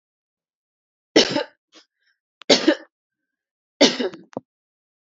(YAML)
three_cough_length: 5.0 s
three_cough_amplitude: 31013
three_cough_signal_mean_std_ratio: 0.27
survey_phase: alpha (2021-03-01 to 2021-08-12)
age: 45-64
gender: Female
wearing_mask: 'No'
symptom_none: true
smoker_status: Current smoker (1 to 10 cigarettes per day)
respiratory_condition_asthma: true
respiratory_condition_other: false
recruitment_source: REACT
submission_delay: 2 days
covid_test_result: Negative
covid_test_method: RT-qPCR